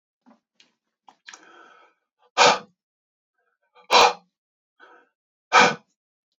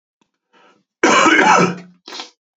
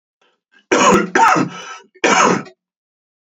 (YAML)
exhalation_length: 6.4 s
exhalation_amplitude: 26470
exhalation_signal_mean_std_ratio: 0.25
cough_length: 2.6 s
cough_amplitude: 31362
cough_signal_mean_std_ratio: 0.47
three_cough_length: 3.2 s
three_cough_amplitude: 32767
three_cough_signal_mean_std_ratio: 0.51
survey_phase: beta (2021-08-13 to 2022-03-07)
age: 18-44
gender: Male
wearing_mask: 'No'
symptom_cough_any: true
smoker_status: Never smoked
respiratory_condition_asthma: false
respiratory_condition_other: false
recruitment_source: REACT
submission_delay: 1 day
covid_test_result: Negative
covid_test_method: RT-qPCR
influenza_a_test_result: Negative
influenza_b_test_result: Negative